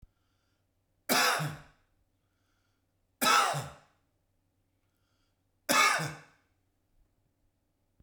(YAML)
three_cough_length: 8.0 s
three_cough_amplitude: 11086
three_cough_signal_mean_std_ratio: 0.32
survey_phase: beta (2021-08-13 to 2022-03-07)
age: 45-64
gender: Male
wearing_mask: 'No'
symptom_none: true
smoker_status: Ex-smoker
respiratory_condition_asthma: false
respiratory_condition_other: false
recruitment_source: REACT
submission_delay: 3 days
covid_test_result: Negative
covid_test_method: RT-qPCR